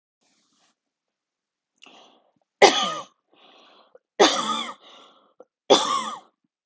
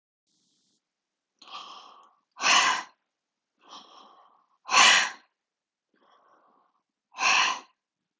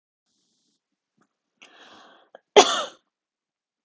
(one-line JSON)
{"three_cough_length": "6.7 s", "three_cough_amplitude": 32766, "three_cough_signal_mean_std_ratio": 0.29, "exhalation_length": "8.2 s", "exhalation_amplitude": 16624, "exhalation_signal_mean_std_ratio": 0.3, "cough_length": "3.8 s", "cough_amplitude": 31663, "cough_signal_mean_std_ratio": 0.17, "survey_phase": "alpha (2021-03-01 to 2021-08-12)", "age": "18-44", "gender": "Female", "wearing_mask": "No", "symptom_none": true, "smoker_status": "Never smoked", "respiratory_condition_asthma": false, "respiratory_condition_other": false, "recruitment_source": "REACT", "submission_delay": "1 day", "covid_test_result": "Negative", "covid_test_method": "RT-qPCR"}